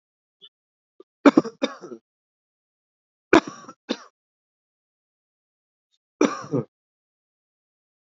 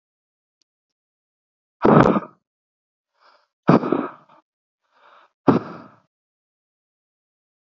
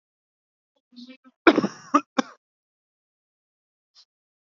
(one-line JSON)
{"three_cough_length": "8.0 s", "three_cough_amplitude": 32767, "three_cough_signal_mean_std_ratio": 0.17, "exhalation_length": "7.7 s", "exhalation_amplitude": 27509, "exhalation_signal_mean_std_ratio": 0.24, "cough_length": "4.4 s", "cough_amplitude": 28474, "cough_signal_mean_std_ratio": 0.18, "survey_phase": "beta (2021-08-13 to 2022-03-07)", "age": "18-44", "gender": "Male", "wearing_mask": "No", "symptom_cough_any": true, "symptom_runny_or_blocked_nose": true, "symptom_sore_throat": true, "symptom_fatigue": true, "symptom_fever_high_temperature": true, "symptom_headache": true, "symptom_onset": "3 days", "smoker_status": "Current smoker (e-cigarettes or vapes only)", "respiratory_condition_asthma": false, "respiratory_condition_other": false, "recruitment_source": "Test and Trace", "submission_delay": "1 day", "covid_test_result": "Positive", "covid_test_method": "RT-qPCR", "covid_ct_value": 16.2, "covid_ct_gene": "ORF1ab gene", "covid_ct_mean": 16.3, "covid_viral_load": "4500000 copies/ml", "covid_viral_load_category": "High viral load (>1M copies/ml)"}